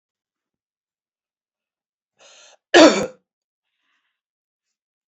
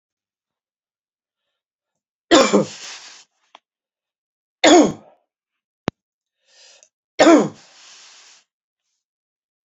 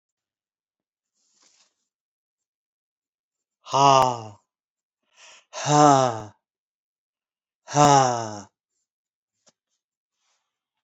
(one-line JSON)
{"cough_length": "5.1 s", "cough_amplitude": 29574, "cough_signal_mean_std_ratio": 0.18, "three_cough_length": "9.6 s", "three_cough_amplitude": 32767, "three_cough_signal_mean_std_ratio": 0.25, "exhalation_length": "10.8 s", "exhalation_amplitude": 25226, "exhalation_signal_mean_std_ratio": 0.27, "survey_phase": "beta (2021-08-13 to 2022-03-07)", "age": "65+", "gender": "Male", "wearing_mask": "No", "symptom_none": true, "smoker_status": "Never smoked", "respiratory_condition_asthma": false, "respiratory_condition_other": false, "recruitment_source": "REACT", "submission_delay": "1 day", "covid_test_result": "Negative", "covid_test_method": "RT-qPCR"}